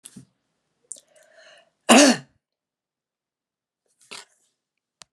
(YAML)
cough_length: 5.1 s
cough_amplitude: 32134
cough_signal_mean_std_ratio: 0.19
survey_phase: beta (2021-08-13 to 2022-03-07)
age: 65+
gender: Female
wearing_mask: 'No'
symptom_none: true
symptom_onset: 5 days
smoker_status: Ex-smoker
respiratory_condition_asthma: false
respiratory_condition_other: false
recruitment_source: Test and Trace
submission_delay: 1 day
covid_test_result: Positive
covid_test_method: RT-qPCR
covid_ct_value: 18.2
covid_ct_gene: ORF1ab gene
covid_ct_mean: 18.5
covid_viral_load: 890000 copies/ml
covid_viral_load_category: Low viral load (10K-1M copies/ml)